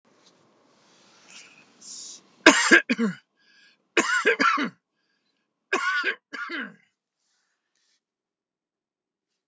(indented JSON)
{
  "three_cough_length": "9.5 s",
  "three_cough_amplitude": 29204,
  "three_cough_signal_mean_std_ratio": 0.31,
  "survey_phase": "beta (2021-08-13 to 2022-03-07)",
  "age": "65+",
  "gender": "Male",
  "wearing_mask": "No",
  "symptom_none": true,
  "smoker_status": "Never smoked",
  "respiratory_condition_asthma": false,
  "respiratory_condition_other": false,
  "recruitment_source": "REACT",
  "submission_delay": "6 days",
  "covid_test_result": "Negative",
  "covid_test_method": "RT-qPCR"
}